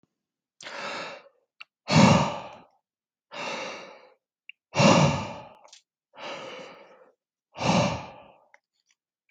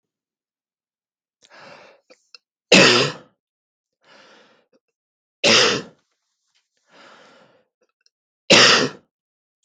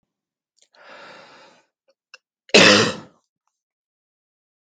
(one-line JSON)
{"exhalation_length": "9.3 s", "exhalation_amplitude": 19661, "exhalation_signal_mean_std_ratio": 0.36, "three_cough_length": "9.6 s", "three_cough_amplitude": 32768, "three_cough_signal_mean_std_ratio": 0.27, "cough_length": "4.6 s", "cough_amplitude": 32768, "cough_signal_mean_std_ratio": 0.23, "survey_phase": "beta (2021-08-13 to 2022-03-07)", "age": "18-44", "gender": "Male", "wearing_mask": "No", "symptom_cough_any": true, "symptom_runny_or_blocked_nose": true, "symptom_headache": true, "smoker_status": "Never smoked", "respiratory_condition_asthma": false, "respiratory_condition_other": false, "recruitment_source": "Test and Trace", "submission_delay": "1 day", "covid_test_result": "Positive", "covid_test_method": "LFT"}